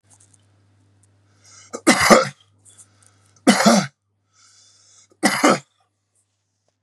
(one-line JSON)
{"three_cough_length": "6.8 s", "three_cough_amplitude": 32768, "three_cough_signal_mean_std_ratio": 0.31, "survey_phase": "beta (2021-08-13 to 2022-03-07)", "age": "45-64", "gender": "Male", "wearing_mask": "No", "symptom_runny_or_blocked_nose": true, "symptom_sore_throat": true, "symptom_onset": "3 days", "smoker_status": "Never smoked", "respiratory_condition_asthma": false, "respiratory_condition_other": false, "recruitment_source": "Test and Trace", "submission_delay": "1 day", "covid_test_result": "Positive", "covid_test_method": "ePCR"}